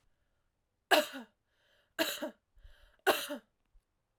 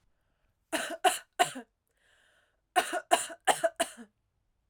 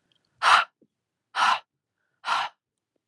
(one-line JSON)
{"three_cough_length": "4.2 s", "three_cough_amplitude": 9489, "three_cough_signal_mean_std_ratio": 0.28, "cough_length": "4.7 s", "cough_amplitude": 13028, "cough_signal_mean_std_ratio": 0.33, "exhalation_length": "3.1 s", "exhalation_amplitude": 19879, "exhalation_signal_mean_std_ratio": 0.35, "survey_phase": "alpha (2021-03-01 to 2021-08-12)", "age": "18-44", "gender": "Female", "wearing_mask": "No", "symptom_cough_any": true, "smoker_status": "Never smoked", "respiratory_condition_asthma": false, "respiratory_condition_other": false, "recruitment_source": "Test and Trace", "submission_delay": "2 days", "covid_test_result": "Positive", "covid_test_method": "RT-qPCR", "covid_ct_value": 31.3, "covid_ct_gene": "N gene"}